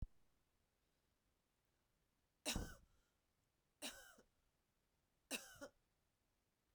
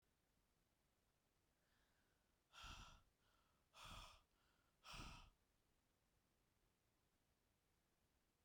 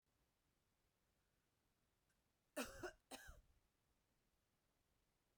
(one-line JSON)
{"three_cough_length": "6.7 s", "three_cough_amplitude": 978, "three_cough_signal_mean_std_ratio": 0.27, "exhalation_length": "8.4 s", "exhalation_amplitude": 210, "exhalation_signal_mean_std_ratio": 0.41, "cough_length": "5.4 s", "cough_amplitude": 669, "cough_signal_mean_std_ratio": 0.26, "survey_phase": "beta (2021-08-13 to 2022-03-07)", "age": "18-44", "gender": "Female", "wearing_mask": "No", "symptom_cough_any": true, "symptom_runny_or_blocked_nose": true, "symptom_shortness_of_breath": true, "symptom_diarrhoea": true, "symptom_fever_high_temperature": true, "symptom_headache": true, "symptom_onset": "3 days", "smoker_status": "Ex-smoker", "respiratory_condition_asthma": false, "respiratory_condition_other": false, "recruitment_source": "Test and Trace", "submission_delay": "2 days", "covid_test_result": "Positive", "covid_test_method": "RT-qPCR"}